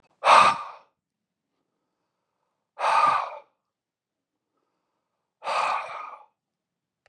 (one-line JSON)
{"exhalation_length": "7.1 s", "exhalation_amplitude": 26111, "exhalation_signal_mean_std_ratio": 0.32, "survey_phase": "beta (2021-08-13 to 2022-03-07)", "age": "45-64", "gender": "Male", "wearing_mask": "No", "symptom_none": true, "smoker_status": "Ex-smoker", "respiratory_condition_asthma": false, "respiratory_condition_other": false, "recruitment_source": "REACT", "submission_delay": "3 days", "covid_test_result": "Negative", "covid_test_method": "RT-qPCR", "influenza_a_test_result": "Negative", "influenza_b_test_result": "Negative"}